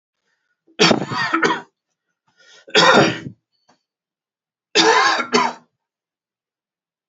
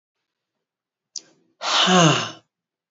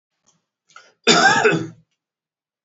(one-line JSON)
{"three_cough_length": "7.1 s", "three_cough_amplitude": 32767, "three_cough_signal_mean_std_ratio": 0.4, "exhalation_length": "2.9 s", "exhalation_amplitude": 26145, "exhalation_signal_mean_std_ratio": 0.37, "cough_length": "2.6 s", "cough_amplitude": 30772, "cough_signal_mean_std_ratio": 0.38, "survey_phase": "beta (2021-08-13 to 2022-03-07)", "age": "45-64", "gender": "Male", "wearing_mask": "No", "symptom_none": true, "smoker_status": "Ex-smoker", "respiratory_condition_asthma": false, "respiratory_condition_other": false, "recruitment_source": "REACT", "submission_delay": "0 days", "covid_test_result": "Negative", "covid_test_method": "RT-qPCR", "influenza_a_test_result": "Negative", "influenza_b_test_result": "Negative"}